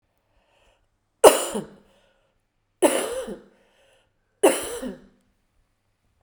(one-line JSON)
{"three_cough_length": "6.2 s", "three_cough_amplitude": 32768, "three_cough_signal_mean_std_ratio": 0.26, "survey_phase": "beta (2021-08-13 to 2022-03-07)", "age": "45-64", "gender": "Female", "wearing_mask": "No", "symptom_cough_any": true, "symptom_shortness_of_breath": true, "symptom_fever_high_temperature": true, "symptom_change_to_sense_of_smell_or_taste": true, "symptom_onset": "4 days", "smoker_status": "Never smoked", "respiratory_condition_asthma": true, "respiratory_condition_other": false, "recruitment_source": "Test and Trace", "submission_delay": "1 day", "covid_test_result": "Positive", "covid_test_method": "RT-qPCR", "covid_ct_value": 14.8, "covid_ct_gene": "ORF1ab gene", "covid_ct_mean": 15.6, "covid_viral_load": "7800000 copies/ml", "covid_viral_load_category": "High viral load (>1M copies/ml)"}